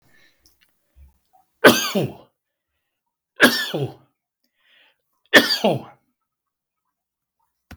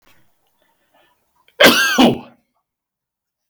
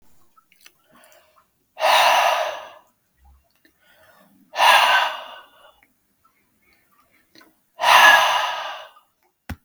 {"three_cough_length": "7.8 s", "three_cough_amplitude": 32768, "three_cough_signal_mean_std_ratio": 0.26, "cough_length": "3.5 s", "cough_amplitude": 32768, "cough_signal_mean_std_ratio": 0.32, "exhalation_length": "9.6 s", "exhalation_amplitude": 32768, "exhalation_signal_mean_std_ratio": 0.38, "survey_phase": "beta (2021-08-13 to 2022-03-07)", "age": "65+", "gender": "Male", "wearing_mask": "No", "symptom_cough_any": true, "smoker_status": "Never smoked", "respiratory_condition_asthma": false, "respiratory_condition_other": false, "recruitment_source": "REACT", "submission_delay": "2 days", "covid_test_result": "Negative", "covid_test_method": "RT-qPCR"}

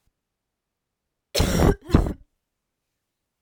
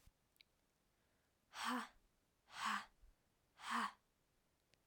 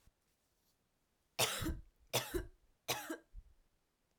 {"cough_length": "3.4 s", "cough_amplitude": 24897, "cough_signal_mean_std_ratio": 0.31, "exhalation_length": "4.9 s", "exhalation_amplitude": 1059, "exhalation_signal_mean_std_ratio": 0.36, "three_cough_length": "4.2 s", "three_cough_amplitude": 3624, "three_cough_signal_mean_std_ratio": 0.37, "survey_phase": "alpha (2021-03-01 to 2021-08-12)", "age": "18-44", "gender": "Female", "wearing_mask": "No", "symptom_cough_any": true, "symptom_new_continuous_cough": true, "symptom_diarrhoea": true, "symptom_fatigue": true, "symptom_fever_high_temperature": true, "symptom_headache": true, "symptom_change_to_sense_of_smell_or_taste": true, "symptom_onset": "4 days", "smoker_status": "Never smoked", "respiratory_condition_asthma": false, "respiratory_condition_other": false, "recruitment_source": "Test and Trace", "submission_delay": "1 day", "covid_test_result": "Positive", "covid_test_method": "RT-qPCR", "covid_ct_value": 15.8, "covid_ct_gene": "ORF1ab gene"}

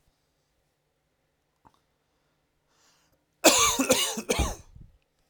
{"cough_length": "5.3 s", "cough_amplitude": 21470, "cough_signal_mean_std_ratio": 0.31, "survey_phase": "beta (2021-08-13 to 2022-03-07)", "age": "18-44", "gender": "Male", "wearing_mask": "No", "symptom_cough_any": true, "symptom_fatigue": true, "symptom_headache": true, "symptom_onset": "3 days", "smoker_status": "Never smoked", "respiratory_condition_asthma": true, "respiratory_condition_other": false, "recruitment_source": "REACT", "submission_delay": "1 day", "covid_test_result": "Negative", "covid_test_method": "RT-qPCR"}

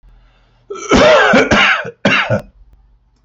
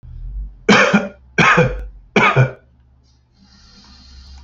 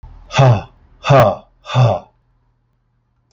{"cough_length": "3.2 s", "cough_amplitude": 29083, "cough_signal_mean_std_ratio": 0.59, "three_cough_length": "4.4 s", "three_cough_amplitude": 29557, "three_cough_signal_mean_std_ratio": 0.46, "exhalation_length": "3.3 s", "exhalation_amplitude": 30148, "exhalation_signal_mean_std_ratio": 0.43, "survey_phase": "beta (2021-08-13 to 2022-03-07)", "age": "45-64", "gender": "Male", "wearing_mask": "Yes", "symptom_none": true, "smoker_status": "Never smoked", "respiratory_condition_asthma": true, "respiratory_condition_other": false, "recruitment_source": "REACT", "submission_delay": "1 day", "covid_test_result": "Negative", "covid_test_method": "RT-qPCR", "influenza_a_test_result": "Negative", "influenza_b_test_result": "Negative"}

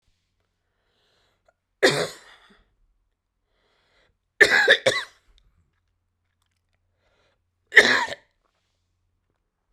{"three_cough_length": "9.7 s", "three_cough_amplitude": 32768, "three_cough_signal_mean_std_ratio": 0.24, "survey_phase": "beta (2021-08-13 to 2022-03-07)", "age": "18-44", "gender": "Female", "wearing_mask": "No", "symptom_none": true, "smoker_status": "Never smoked", "respiratory_condition_asthma": false, "respiratory_condition_other": false, "recruitment_source": "REACT", "submission_delay": "1 day", "covid_test_result": "Negative", "covid_test_method": "RT-qPCR"}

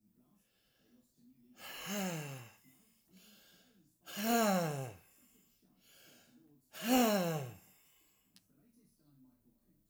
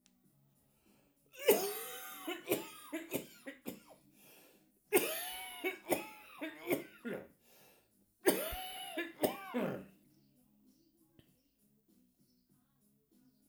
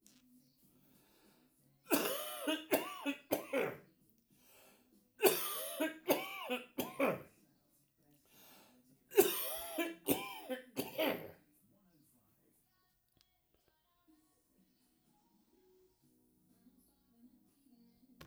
{"exhalation_length": "9.9 s", "exhalation_amplitude": 4241, "exhalation_signal_mean_std_ratio": 0.38, "cough_length": "13.5 s", "cough_amplitude": 6726, "cough_signal_mean_std_ratio": 0.39, "three_cough_length": "18.3 s", "three_cough_amplitude": 7155, "three_cough_signal_mean_std_ratio": 0.35, "survey_phase": "alpha (2021-03-01 to 2021-08-12)", "age": "65+", "gender": "Male", "wearing_mask": "No", "symptom_none": true, "smoker_status": "Ex-smoker", "respiratory_condition_asthma": false, "respiratory_condition_other": false, "recruitment_source": "REACT", "submission_delay": "3 days", "covid_test_result": "Negative", "covid_test_method": "RT-qPCR"}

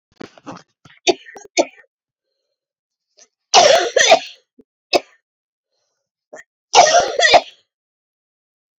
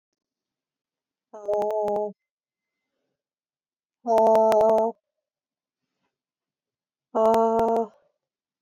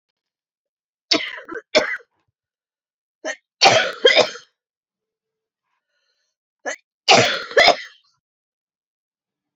{"cough_length": "8.8 s", "cough_amplitude": 32768, "cough_signal_mean_std_ratio": 0.32, "exhalation_length": "8.6 s", "exhalation_amplitude": 11038, "exhalation_signal_mean_std_ratio": 0.38, "three_cough_length": "9.6 s", "three_cough_amplitude": 31751, "three_cough_signal_mean_std_ratio": 0.3, "survey_phase": "beta (2021-08-13 to 2022-03-07)", "age": "45-64", "gender": "Female", "wearing_mask": "No", "symptom_cough_any": true, "symptom_diarrhoea": true, "symptom_fatigue": true, "symptom_fever_high_temperature": true, "symptom_headache": true, "symptom_change_to_sense_of_smell_or_taste": true, "symptom_loss_of_taste": true, "symptom_onset": "4 days", "smoker_status": "Current smoker (1 to 10 cigarettes per day)", "respiratory_condition_asthma": true, "respiratory_condition_other": false, "recruitment_source": "Test and Trace", "submission_delay": "1 day", "covid_test_result": "Positive", "covid_test_method": "RT-qPCR"}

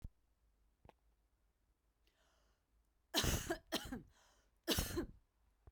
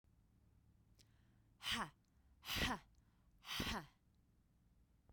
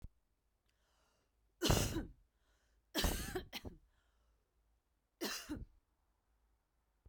{"cough_length": "5.7 s", "cough_amplitude": 2585, "cough_signal_mean_std_ratio": 0.34, "exhalation_length": "5.1 s", "exhalation_amplitude": 1483, "exhalation_signal_mean_std_ratio": 0.39, "three_cough_length": "7.1 s", "three_cough_amplitude": 4331, "three_cough_signal_mean_std_ratio": 0.33, "survey_phase": "beta (2021-08-13 to 2022-03-07)", "age": "18-44", "gender": "Female", "wearing_mask": "No", "symptom_runny_or_blocked_nose": true, "symptom_sore_throat": true, "symptom_fatigue": true, "symptom_headache": true, "smoker_status": "Never smoked", "respiratory_condition_asthma": false, "respiratory_condition_other": false, "recruitment_source": "Test and Trace", "submission_delay": "2 days", "covid_test_result": "Positive", "covid_test_method": "LFT"}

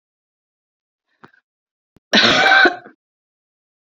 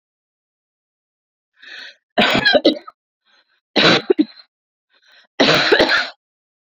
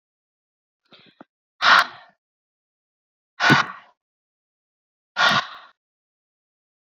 {"cough_length": "3.8 s", "cough_amplitude": 29548, "cough_signal_mean_std_ratio": 0.33, "three_cough_length": "6.7 s", "three_cough_amplitude": 32425, "three_cough_signal_mean_std_ratio": 0.39, "exhalation_length": "6.8 s", "exhalation_amplitude": 27023, "exhalation_signal_mean_std_ratio": 0.26, "survey_phase": "alpha (2021-03-01 to 2021-08-12)", "age": "18-44", "gender": "Female", "wearing_mask": "No", "symptom_change_to_sense_of_smell_or_taste": true, "symptom_loss_of_taste": true, "symptom_onset": "2 days", "smoker_status": "Current smoker (1 to 10 cigarettes per day)", "respiratory_condition_asthma": false, "respiratory_condition_other": false, "recruitment_source": "Test and Trace", "submission_delay": "1 day", "covid_test_result": "Positive", "covid_test_method": "RT-qPCR", "covid_ct_value": 20.5, "covid_ct_gene": "N gene", "covid_ct_mean": 20.6, "covid_viral_load": "170000 copies/ml", "covid_viral_load_category": "Low viral load (10K-1M copies/ml)"}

